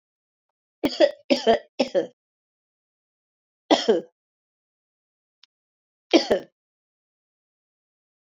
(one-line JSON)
{"three_cough_length": "8.3 s", "three_cough_amplitude": 25154, "three_cough_signal_mean_std_ratio": 0.26, "survey_phase": "beta (2021-08-13 to 2022-03-07)", "age": "65+", "gender": "Female", "wearing_mask": "No", "symptom_cough_any": true, "symptom_runny_or_blocked_nose": true, "symptom_headache": true, "symptom_other": true, "smoker_status": "Never smoked", "respiratory_condition_asthma": false, "respiratory_condition_other": false, "recruitment_source": "Test and Trace", "submission_delay": "2 days", "covid_test_result": "Positive", "covid_test_method": "RT-qPCR", "covid_ct_value": 13.6, "covid_ct_gene": "ORF1ab gene", "covid_ct_mean": 14.0, "covid_viral_load": "25000000 copies/ml", "covid_viral_load_category": "High viral load (>1M copies/ml)"}